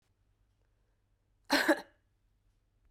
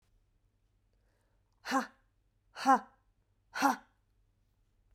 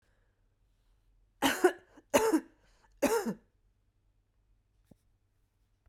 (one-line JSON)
{"cough_length": "2.9 s", "cough_amplitude": 6236, "cough_signal_mean_std_ratio": 0.24, "exhalation_length": "4.9 s", "exhalation_amplitude": 6983, "exhalation_signal_mean_std_ratio": 0.25, "three_cough_length": "5.9 s", "three_cough_amplitude": 10719, "three_cough_signal_mean_std_ratio": 0.29, "survey_phase": "beta (2021-08-13 to 2022-03-07)", "age": "45-64", "gender": "Female", "wearing_mask": "Yes", "symptom_cough_any": true, "symptom_runny_or_blocked_nose": true, "symptom_diarrhoea": true, "symptom_fatigue": true, "symptom_onset": "3 days", "smoker_status": "Current smoker (e-cigarettes or vapes only)", "respiratory_condition_asthma": false, "respiratory_condition_other": false, "recruitment_source": "Test and Trace", "submission_delay": "1 day", "covid_test_result": "Positive", "covid_test_method": "RT-qPCR", "covid_ct_value": 21.8, "covid_ct_gene": "N gene", "covid_ct_mean": 21.9, "covid_viral_load": "64000 copies/ml", "covid_viral_load_category": "Low viral load (10K-1M copies/ml)"}